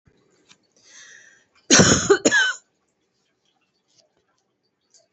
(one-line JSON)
{"cough_length": "5.1 s", "cough_amplitude": 31309, "cough_signal_mean_std_ratio": 0.3, "survey_phase": "beta (2021-08-13 to 2022-03-07)", "age": "45-64", "gender": "Female", "wearing_mask": "No", "symptom_shortness_of_breath": true, "symptom_fatigue": true, "symptom_headache": true, "symptom_onset": "11 days", "smoker_status": "Ex-smoker", "respiratory_condition_asthma": false, "respiratory_condition_other": true, "recruitment_source": "REACT", "submission_delay": "3 days", "covid_test_result": "Negative", "covid_test_method": "RT-qPCR", "influenza_a_test_result": "Negative", "influenza_b_test_result": "Negative"}